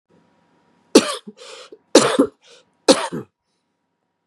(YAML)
three_cough_length: 4.3 s
three_cough_amplitude: 32768
three_cough_signal_mean_std_ratio: 0.28
survey_phase: beta (2021-08-13 to 2022-03-07)
age: 45-64
gender: Male
wearing_mask: 'No'
symptom_new_continuous_cough: true
symptom_runny_or_blocked_nose: true
symptom_fatigue: true
symptom_fever_high_temperature: true
symptom_headache: true
symptom_change_to_sense_of_smell_or_taste: true
symptom_loss_of_taste: true
smoker_status: Never smoked
respiratory_condition_asthma: false
respiratory_condition_other: false
recruitment_source: Test and Trace
submission_delay: 2 days
covid_test_result: Positive
covid_test_method: RT-qPCR
covid_ct_value: 20.4
covid_ct_gene: N gene